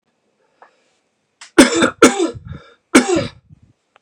{
  "three_cough_length": "4.0 s",
  "three_cough_amplitude": 32768,
  "three_cough_signal_mean_std_ratio": 0.34,
  "survey_phase": "beta (2021-08-13 to 2022-03-07)",
  "age": "18-44",
  "gender": "Male",
  "wearing_mask": "No",
  "symptom_cough_any": true,
  "symptom_runny_or_blocked_nose": true,
  "symptom_shortness_of_breath": true,
  "symptom_sore_throat": true,
  "symptom_fatigue": true,
  "symptom_onset": "4 days",
  "smoker_status": "Ex-smoker",
  "respiratory_condition_asthma": false,
  "respiratory_condition_other": false,
  "recruitment_source": "Test and Trace",
  "submission_delay": "2 days",
  "covid_test_result": "Positive",
  "covid_test_method": "RT-qPCR"
}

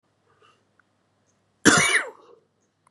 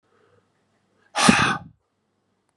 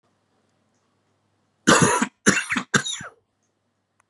{
  "cough_length": "2.9 s",
  "cough_amplitude": 28564,
  "cough_signal_mean_std_ratio": 0.29,
  "exhalation_length": "2.6 s",
  "exhalation_amplitude": 32767,
  "exhalation_signal_mean_std_ratio": 0.3,
  "three_cough_length": "4.1 s",
  "three_cough_amplitude": 27803,
  "three_cough_signal_mean_std_ratio": 0.34,
  "survey_phase": "beta (2021-08-13 to 2022-03-07)",
  "age": "18-44",
  "gender": "Male",
  "wearing_mask": "No",
  "symptom_cough_any": true,
  "symptom_runny_or_blocked_nose": true,
  "symptom_shortness_of_breath": true,
  "symptom_sore_throat": true,
  "symptom_fatigue": true,
  "symptom_headache": true,
  "symptom_change_to_sense_of_smell_or_taste": true,
  "symptom_onset": "3 days",
  "smoker_status": "Never smoked",
  "respiratory_condition_asthma": false,
  "respiratory_condition_other": false,
  "recruitment_source": "Test and Trace",
  "submission_delay": "2 days",
  "covid_test_result": "Positive",
  "covid_test_method": "RT-qPCR",
  "covid_ct_value": 16.3,
  "covid_ct_gene": "ORF1ab gene",
  "covid_ct_mean": 16.6,
  "covid_viral_load": "3500000 copies/ml",
  "covid_viral_load_category": "High viral load (>1M copies/ml)"
}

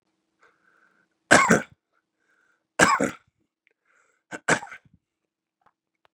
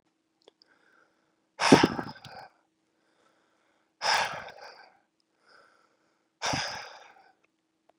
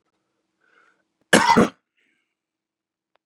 {
  "three_cough_length": "6.1 s",
  "three_cough_amplitude": 31767,
  "three_cough_signal_mean_std_ratio": 0.24,
  "exhalation_length": "8.0 s",
  "exhalation_amplitude": 24447,
  "exhalation_signal_mean_std_ratio": 0.24,
  "cough_length": "3.3 s",
  "cough_amplitude": 31324,
  "cough_signal_mean_std_ratio": 0.24,
  "survey_phase": "beta (2021-08-13 to 2022-03-07)",
  "age": "18-44",
  "gender": "Male",
  "wearing_mask": "No",
  "symptom_runny_or_blocked_nose": true,
  "symptom_onset": "3 days",
  "smoker_status": "Never smoked",
  "respiratory_condition_asthma": true,
  "respiratory_condition_other": false,
  "recruitment_source": "REACT",
  "submission_delay": "1 day",
  "covid_test_result": "Positive",
  "covid_test_method": "RT-qPCR",
  "covid_ct_value": 33.0,
  "covid_ct_gene": "N gene",
  "influenza_a_test_result": "Negative",
  "influenza_b_test_result": "Negative"
}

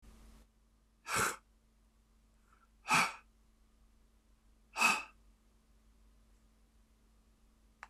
{
  "exhalation_length": "7.9 s",
  "exhalation_amplitude": 5059,
  "exhalation_signal_mean_std_ratio": 0.27,
  "survey_phase": "beta (2021-08-13 to 2022-03-07)",
  "age": "65+",
  "gender": "Male",
  "wearing_mask": "No",
  "symptom_none": true,
  "smoker_status": "Never smoked",
  "respiratory_condition_asthma": false,
  "respiratory_condition_other": false,
  "recruitment_source": "REACT",
  "submission_delay": "5 days",
  "covid_test_result": "Negative",
  "covid_test_method": "RT-qPCR",
  "influenza_a_test_result": "Negative",
  "influenza_b_test_result": "Negative"
}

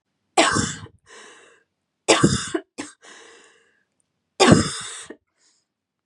{
  "three_cough_length": "6.1 s",
  "three_cough_amplitude": 32767,
  "three_cough_signal_mean_std_ratio": 0.33,
  "survey_phase": "beta (2021-08-13 to 2022-03-07)",
  "age": "18-44",
  "gender": "Female",
  "wearing_mask": "No",
  "symptom_headache": true,
  "smoker_status": "Never smoked",
  "respiratory_condition_asthma": false,
  "respiratory_condition_other": false,
  "recruitment_source": "Test and Trace",
  "submission_delay": "1 day",
  "covid_test_result": "Positive",
  "covid_test_method": "RT-qPCR",
  "covid_ct_value": 29.6,
  "covid_ct_gene": "N gene",
  "covid_ct_mean": 30.5,
  "covid_viral_load": "100 copies/ml",
  "covid_viral_load_category": "Minimal viral load (< 10K copies/ml)"
}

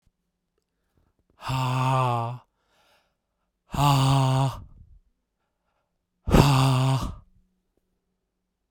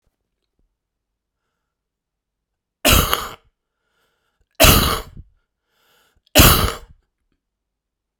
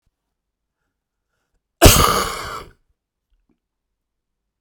{
  "exhalation_length": "8.7 s",
  "exhalation_amplitude": 31766,
  "exhalation_signal_mean_std_ratio": 0.45,
  "three_cough_length": "8.2 s",
  "three_cough_amplitude": 32768,
  "three_cough_signal_mean_std_ratio": 0.28,
  "cough_length": "4.6 s",
  "cough_amplitude": 32768,
  "cough_signal_mean_std_ratio": 0.25,
  "survey_phase": "beta (2021-08-13 to 2022-03-07)",
  "age": "18-44",
  "gender": "Male",
  "wearing_mask": "No",
  "symptom_cough_any": true,
  "symptom_onset": "9 days",
  "smoker_status": "Never smoked",
  "respiratory_condition_asthma": true,
  "respiratory_condition_other": true,
  "recruitment_source": "REACT",
  "submission_delay": "2 days",
  "covid_test_result": "Negative",
  "covid_test_method": "RT-qPCR"
}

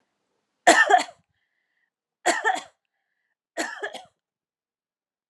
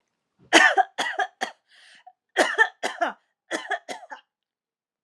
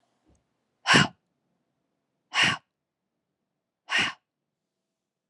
{
  "three_cough_length": "5.3 s",
  "three_cough_amplitude": 25552,
  "three_cough_signal_mean_std_ratio": 0.28,
  "cough_length": "5.0 s",
  "cough_amplitude": 30635,
  "cough_signal_mean_std_ratio": 0.35,
  "exhalation_length": "5.3 s",
  "exhalation_amplitude": 17969,
  "exhalation_signal_mean_std_ratio": 0.26,
  "survey_phase": "alpha (2021-03-01 to 2021-08-12)",
  "age": "45-64",
  "gender": "Female",
  "wearing_mask": "No",
  "symptom_none": true,
  "smoker_status": "Never smoked",
  "respiratory_condition_asthma": false,
  "respiratory_condition_other": false,
  "recruitment_source": "REACT",
  "submission_delay": "1 day",
  "covid_test_result": "Negative",
  "covid_test_method": "RT-qPCR"
}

